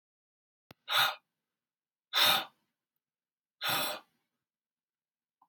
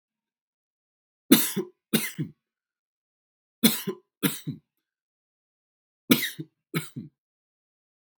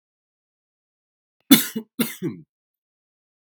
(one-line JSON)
{"exhalation_length": "5.5 s", "exhalation_amplitude": 8106, "exhalation_signal_mean_std_ratio": 0.31, "three_cough_length": "8.2 s", "three_cough_amplitude": 26722, "three_cough_signal_mean_std_ratio": 0.25, "cough_length": "3.5 s", "cough_amplitude": 32768, "cough_signal_mean_std_ratio": 0.21, "survey_phase": "beta (2021-08-13 to 2022-03-07)", "age": "18-44", "gender": "Male", "wearing_mask": "No", "symptom_cough_any": true, "symptom_shortness_of_breath": true, "symptom_other": true, "symptom_onset": "2 days", "smoker_status": "Ex-smoker", "respiratory_condition_asthma": false, "respiratory_condition_other": false, "recruitment_source": "REACT", "submission_delay": "0 days", "covid_test_result": "Negative", "covid_test_method": "RT-qPCR"}